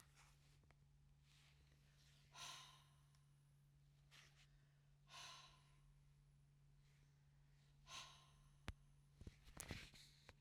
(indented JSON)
{
  "exhalation_length": "10.4 s",
  "exhalation_amplitude": 1214,
  "exhalation_signal_mean_std_ratio": 0.62,
  "survey_phase": "beta (2021-08-13 to 2022-03-07)",
  "age": "45-64",
  "gender": "Female",
  "wearing_mask": "No",
  "symptom_none": true,
  "smoker_status": "Ex-smoker",
  "respiratory_condition_asthma": false,
  "respiratory_condition_other": false,
  "recruitment_source": "REACT",
  "submission_delay": "3 days",
  "covid_test_result": "Negative",
  "covid_test_method": "RT-qPCR",
  "influenza_a_test_result": "Negative",
  "influenza_b_test_result": "Negative"
}